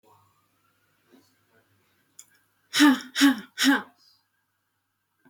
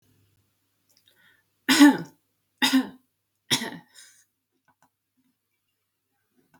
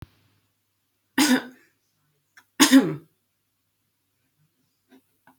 {
  "exhalation_length": "5.3 s",
  "exhalation_amplitude": 15722,
  "exhalation_signal_mean_std_ratio": 0.29,
  "three_cough_length": "6.6 s",
  "three_cough_amplitude": 23990,
  "three_cough_signal_mean_std_ratio": 0.23,
  "cough_length": "5.4 s",
  "cough_amplitude": 32767,
  "cough_signal_mean_std_ratio": 0.24,
  "survey_phase": "beta (2021-08-13 to 2022-03-07)",
  "age": "18-44",
  "gender": "Female",
  "wearing_mask": "No",
  "symptom_none": true,
  "smoker_status": "Never smoked",
  "respiratory_condition_asthma": false,
  "respiratory_condition_other": false,
  "recruitment_source": "REACT",
  "submission_delay": "1 day",
  "covid_test_result": "Negative",
  "covid_test_method": "RT-qPCR",
  "influenza_a_test_result": "Negative",
  "influenza_b_test_result": "Negative"
}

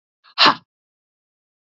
{
  "exhalation_length": "1.8 s",
  "exhalation_amplitude": 31323,
  "exhalation_signal_mean_std_ratio": 0.22,
  "survey_phase": "beta (2021-08-13 to 2022-03-07)",
  "age": "45-64",
  "gender": "Female",
  "wearing_mask": "No",
  "symptom_sore_throat": true,
  "symptom_onset": "12 days",
  "smoker_status": "Ex-smoker",
  "respiratory_condition_asthma": false,
  "respiratory_condition_other": false,
  "recruitment_source": "REACT",
  "submission_delay": "2 days",
  "covid_test_result": "Negative",
  "covid_test_method": "RT-qPCR",
  "influenza_a_test_result": "Negative",
  "influenza_b_test_result": "Negative"
}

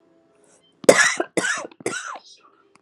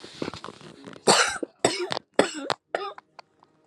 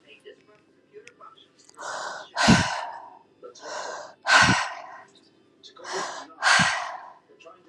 {
  "cough_length": "2.8 s",
  "cough_amplitude": 32768,
  "cough_signal_mean_std_ratio": 0.33,
  "three_cough_length": "3.7 s",
  "three_cough_amplitude": 26700,
  "three_cough_signal_mean_std_ratio": 0.38,
  "exhalation_length": "7.7 s",
  "exhalation_amplitude": 21287,
  "exhalation_signal_mean_std_ratio": 0.41,
  "survey_phase": "alpha (2021-03-01 to 2021-08-12)",
  "age": "45-64",
  "gender": "Female",
  "wearing_mask": "No",
  "symptom_cough_any": true,
  "symptom_shortness_of_breath": true,
  "symptom_fatigue": true,
  "symptom_headache": true,
  "symptom_loss_of_taste": true,
  "symptom_onset": "5 days",
  "smoker_status": "Never smoked",
  "respiratory_condition_asthma": false,
  "respiratory_condition_other": false,
  "recruitment_source": "Test and Trace",
  "submission_delay": "2 days",
  "covid_test_result": "Positive",
  "covid_test_method": "RT-qPCR",
  "covid_ct_value": 12.9,
  "covid_ct_gene": "N gene",
  "covid_ct_mean": 13.4,
  "covid_viral_load": "40000000 copies/ml",
  "covid_viral_load_category": "High viral load (>1M copies/ml)"
}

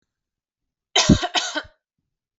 {
  "cough_length": "2.4 s",
  "cough_amplitude": 27401,
  "cough_signal_mean_std_ratio": 0.31,
  "survey_phase": "alpha (2021-03-01 to 2021-08-12)",
  "age": "18-44",
  "gender": "Female",
  "wearing_mask": "No",
  "symptom_none": true,
  "smoker_status": "Never smoked",
  "respiratory_condition_asthma": false,
  "respiratory_condition_other": false,
  "recruitment_source": "Test and Trace",
  "submission_delay": "0 days",
  "covid_test_result": "Negative",
  "covid_test_method": "LFT"
}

